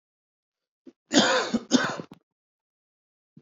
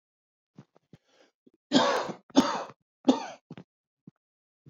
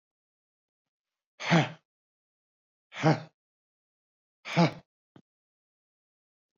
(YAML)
cough_length: 3.4 s
cough_amplitude: 20775
cough_signal_mean_std_ratio: 0.34
three_cough_length: 4.7 s
three_cough_amplitude: 16761
three_cough_signal_mean_std_ratio: 0.3
exhalation_length: 6.6 s
exhalation_amplitude: 9770
exhalation_signal_mean_std_ratio: 0.24
survey_phase: beta (2021-08-13 to 2022-03-07)
age: 18-44
gender: Male
wearing_mask: 'No'
symptom_cough_any: true
symptom_runny_or_blocked_nose: true
symptom_onset: 12 days
smoker_status: Ex-smoker
respiratory_condition_asthma: false
respiratory_condition_other: false
recruitment_source: REACT
submission_delay: 3 days
covid_test_result: Negative
covid_test_method: RT-qPCR
influenza_a_test_result: Unknown/Void
influenza_b_test_result: Unknown/Void